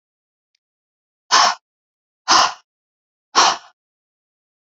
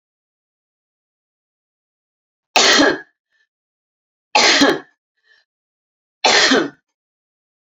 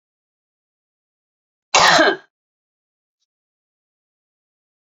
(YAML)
exhalation_length: 4.7 s
exhalation_amplitude: 32768
exhalation_signal_mean_std_ratio: 0.29
three_cough_length: 7.7 s
three_cough_amplitude: 32768
three_cough_signal_mean_std_ratio: 0.33
cough_length: 4.9 s
cough_amplitude: 30618
cough_signal_mean_std_ratio: 0.23
survey_phase: beta (2021-08-13 to 2022-03-07)
age: 45-64
gender: Female
wearing_mask: 'No'
symptom_none: true
smoker_status: Ex-smoker
respiratory_condition_asthma: false
respiratory_condition_other: false
recruitment_source: REACT
submission_delay: 1 day
covid_test_result: Negative
covid_test_method: RT-qPCR